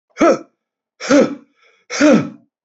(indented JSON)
{
  "exhalation_length": "2.6 s",
  "exhalation_amplitude": 29271,
  "exhalation_signal_mean_std_ratio": 0.44,
  "survey_phase": "beta (2021-08-13 to 2022-03-07)",
  "age": "45-64",
  "gender": "Male",
  "wearing_mask": "No",
  "symptom_none": true,
  "symptom_onset": "12 days",
  "smoker_status": "Never smoked",
  "respiratory_condition_asthma": false,
  "respiratory_condition_other": false,
  "recruitment_source": "REACT",
  "submission_delay": "3 days",
  "covid_test_result": "Negative",
  "covid_test_method": "RT-qPCR"
}